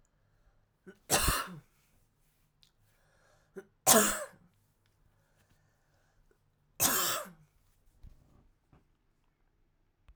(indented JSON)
{
  "three_cough_length": "10.2 s",
  "three_cough_amplitude": 14001,
  "three_cough_signal_mean_std_ratio": 0.26,
  "survey_phase": "alpha (2021-03-01 to 2021-08-12)",
  "age": "18-44",
  "gender": "Female",
  "wearing_mask": "No",
  "symptom_cough_any": true,
  "symptom_fatigue": true,
  "symptom_fever_high_temperature": true,
  "symptom_change_to_sense_of_smell_or_taste": true,
  "symptom_onset": "2 days",
  "smoker_status": "Current smoker (e-cigarettes or vapes only)",
  "respiratory_condition_asthma": false,
  "respiratory_condition_other": false,
  "recruitment_source": "Test and Trace",
  "submission_delay": "2 days",
  "covid_test_result": "Positive",
  "covid_test_method": "RT-qPCR",
  "covid_ct_value": 31.3,
  "covid_ct_gene": "N gene"
}